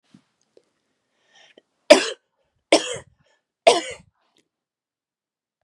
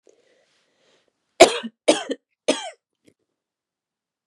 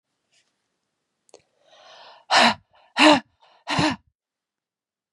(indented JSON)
{
  "three_cough_length": "5.6 s",
  "three_cough_amplitude": 32768,
  "three_cough_signal_mean_std_ratio": 0.19,
  "cough_length": "4.3 s",
  "cough_amplitude": 32768,
  "cough_signal_mean_std_ratio": 0.2,
  "exhalation_length": "5.1 s",
  "exhalation_amplitude": 31285,
  "exhalation_signal_mean_std_ratio": 0.29,
  "survey_phase": "beta (2021-08-13 to 2022-03-07)",
  "age": "45-64",
  "gender": "Female",
  "wearing_mask": "No",
  "symptom_none": true,
  "smoker_status": "Never smoked",
  "respiratory_condition_asthma": false,
  "respiratory_condition_other": false,
  "recruitment_source": "REACT",
  "submission_delay": "1 day",
  "covid_test_result": "Negative",
  "covid_test_method": "RT-qPCR"
}